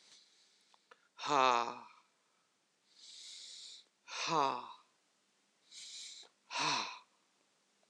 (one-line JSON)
{"exhalation_length": "7.9 s", "exhalation_amplitude": 5972, "exhalation_signal_mean_std_ratio": 0.33, "survey_phase": "beta (2021-08-13 to 2022-03-07)", "age": "18-44", "gender": "Male", "wearing_mask": "No", "symptom_none": true, "smoker_status": "Ex-smoker", "respiratory_condition_asthma": false, "respiratory_condition_other": false, "recruitment_source": "REACT", "submission_delay": "3 days", "covid_test_result": "Negative", "covid_test_method": "RT-qPCR"}